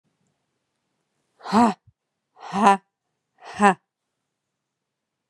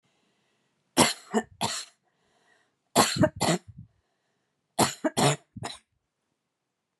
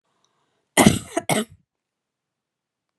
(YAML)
exhalation_length: 5.3 s
exhalation_amplitude: 31954
exhalation_signal_mean_std_ratio: 0.25
three_cough_length: 7.0 s
three_cough_amplitude: 22506
three_cough_signal_mean_std_ratio: 0.33
cough_length: 3.0 s
cough_amplitude: 32768
cough_signal_mean_std_ratio: 0.25
survey_phase: beta (2021-08-13 to 2022-03-07)
age: 45-64
gender: Female
wearing_mask: 'No'
symptom_cough_any: true
symptom_runny_or_blocked_nose: true
symptom_fatigue: true
symptom_fever_high_temperature: true
symptom_headache: true
symptom_change_to_sense_of_smell_or_taste: true
symptom_loss_of_taste: true
symptom_onset: 3 days
smoker_status: Never smoked
respiratory_condition_asthma: false
respiratory_condition_other: false
recruitment_source: Test and Trace
submission_delay: 1 day
covid_test_result: Positive
covid_test_method: RT-qPCR
covid_ct_value: 17.2
covid_ct_gene: ORF1ab gene
covid_ct_mean: 18.1
covid_viral_load: 1200000 copies/ml
covid_viral_load_category: High viral load (>1M copies/ml)